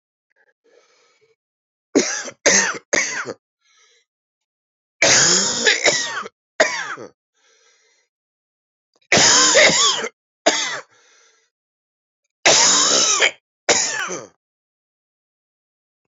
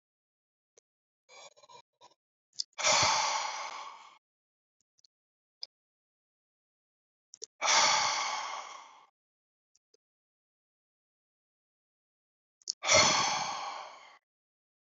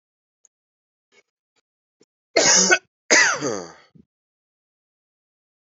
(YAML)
three_cough_length: 16.1 s
three_cough_amplitude: 29328
three_cough_signal_mean_std_ratio: 0.43
exhalation_length: 14.9 s
exhalation_amplitude: 10432
exhalation_signal_mean_std_ratio: 0.33
cough_length: 5.7 s
cough_amplitude: 28353
cough_signal_mean_std_ratio: 0.3
survey_phase: beta (2021-08-13 to 2022-03-07)
age: 45-64
gender: Male
wearing_mask: 'No'
symptom_cough_any: true
symptom_runny_or_blocked_nose: true
symptom_shortness_of_breath: true
symptom_fatigue: true
symptom_fever_high_temperature: true
symptom_headache: true
symptom_change_to_sense_of_smell_or_taste: true
symptom_loss_of_taste: true
symptom_other: true
smoker_status: Ex-smoker
respiratory_condition_asthma: false
respiratory_condition_other: false
recruitment_source: Test and Trace
submission_delay: 1 day
covid_test_result: Positive
covid_test_method: LFT